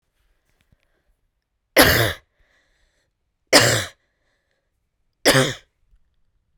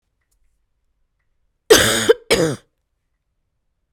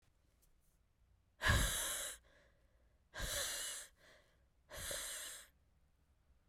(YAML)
three_cough_length: 6.6 s
three_cough_amplitude: 32768
three_cough_signal_mean_std_ratio: 0.28
cough_length: 3.9 s
cough_amplitude: 32768
cough_signal_mean_std_ratio: 0.29
exhalation_length: 6.5 s
exhalation_amplitude: 3385
exhalation_signal_mean_std_ratio: 0.43
survey_phase: beta (2021-08-13 to 2022-03-07)
age: 18-44
gender: Female
wearing_mask: 'No'
symptom_cough_any: true
symptom_new_continuous_cough: true
symptom_runny_or_blocked_nose: true
symptom_sore_throat: true
symptom_headache: true
symptom_onset: 4 days
smoker_status: Current smoker (e-cigarettes or vapes only)
respiratory_condition_asthma: false
respiratory_condition_other: false
recruitment_source: Test and Trace
submission_delay: 1 day
covid_test_result: Positive
covid_test_method: RT-qPCR